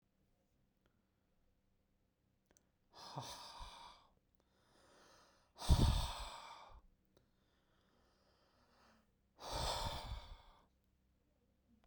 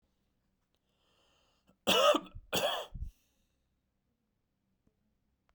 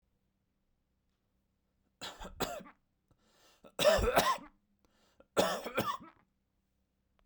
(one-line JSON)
{"exhalation_length": "11.9 s", "exhalation_amplitude": 3798, "exhalation_signal_mean_std_ratio": 0.28, "cough_length": "5.5 s", "cough_amplitude": 7571, "cough_signal_mean_std_ratio": 0.28, "three_cough_length": "7.3 s", "three_cough_amplitude": 7561, "three_cough_signal_mean_std_ratio": 0.33, "survey_phase": "beta (2021-08-13 to 2022-03-07)", "age": "18-44", "gender": "Male", "wearing_mask": "No", "symptom_none": true, "smoker_status": "Never smoked", "respiratory_condition_asthma": false, "respiratory_condition_other": false, "recruitment_source": "REACT", "submission_delay": "1 day", "covid_test_result": "Negative", "covid_test_method": "RT-qPCR"}